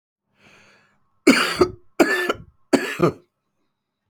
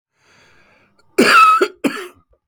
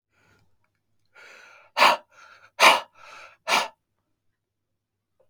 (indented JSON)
{
  "three_cough_length": "4.1 s",
  "three_cough_amplitude": 28911,
  "three_cough_signal_mean_std_ratio": 0.36,
  "cough_length": "2.5 s",
  "cough_amplitude": 30953,
  "cough_signal_mean_std_ratio": 0.43,
  "exhalation_length": "5.3 s",
  "exhalation_amplitude": 28035,
  "exhalation_signal_mean_std_ratio": 0.26,
  "survey_phase": "beta (2021-08-13 to 2022-03-07)",
  "age": "45-64",
  "gender": "Male",
  "wearing_mask": "No",
  "symptom_cough_any": true,
  "symptom_runny_or_blocked_nose": true,
  "symptom_shortness_of_breath": true,
  "symptom_fatigue": true,
  "symptom_fever_high_temperature": true,
  "symptom_headache": true,
  "symptom_change_to_sense_of_smell_or_taste": true,
  "symptom_loss_of_taste": true,
  "symptom_onset": "4 days",
  "smoker_status": "Ex-smoker",
  "respiratory_condition_asthma": true,
  "respiratory_condition_other": false,
  "recruitment_source": "Test and Trace",
  "submission_delay": "2 days",
  "covid_test_result": "Positive",
  "covid_test_method": "RT-qPCR",
  "covid_ct_value": 20.9,
  "covid_ct_gene": "ORF1ab gene"
}